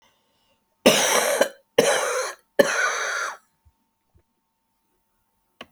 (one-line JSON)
{"cough_length": "5.7 s", "cough_amplitude": 29770, "cough_signal_mean_std_ratio": 0.42, "survey_phase": "beta (2021-08-13 to 2022-03-07)", "age": "65+", "gender": "Female", "wearing_mask": "No", "symptom_cough_any": true, "symptom_shortness_of_breath": true, "symptom_fatigue": true, "smoker_status": "Never smoked", "respiratory_condition_asthma": false, "respiratory_condition_other": true, "recruitment_source": "REACT", "submission_delay": "1 day", "covid_test_result": "Negative", "covid_test_method": "RT-qPCR"}